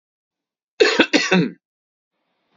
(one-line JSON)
{"cough_length": "2.6 s", "cough_amplitude": 30100, "cough_signal_mean_std_ratio": 0.37, "survey_phase": "beta (2021-08-13 to 2022-03-07)", "age": "45-64", "gender": "Male", "wearing_mask": "No", "symptom_none": true, "smoker_status": "Ex-smoker", "respiratory_condition_asthma": false, "respiratory_condition_other": false, "recruitment_source": "REACT", "submission_delay": "2 days", "covid_test_result": "Negative", "covid_test_method": "RT-qPCR", "influenza_a_test_result": "Negative", "influenza_b_test_result": "Negative"}